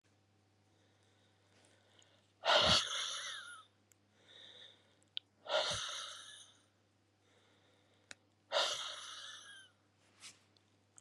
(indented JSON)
{
  "exhalation_length": "11.0 s",
  "exhalation_amplitude": 4731,
  "exhalation_signal_mean_std_ratio": 0.34,
  "survey_phase": "beta (2021-08-13 to 2022-03-07)",
  "age": "65+",
  "gender": "Female",
  "wearing_mask": "No",
  "symptom_cough_any": true,
  "symptom_new_continuous_cough": true,
  "symptom_runny_or_blocked_nose": true,
  "symptom_shortness_of_breath": true,
  "symptom_sore_throat": true,
  "symptom_fatigue": true,
  "symptom_fever_high_temperature": true,
  "symptom_headache": true,
  "symptom_change_to_sense_of_smell_or_taste": true,
  "symptom_loss_of_taste": true,
  "symptom_other": true,
  "smoker_status": "Never smoked",
  "respiratory_condition_asthma": false,
  "respiratory_condition_other": false,
  "recruitment_source": "Test and Trace",
  "submission_delay": "2 days",
  "covid_test_result": "Positive",
  "covid_test_method": "RT-qPCR",
  "covid_ct_value": 22.4,
  "covid_ct_gene": "ORF1ab gene",
  "covid_ct_mean": 22.9,
  "covid_viral_load": "32000 copies/ml",
  "covid_viral_load_category": "Low viral load (10K-1M copies/ml)"
}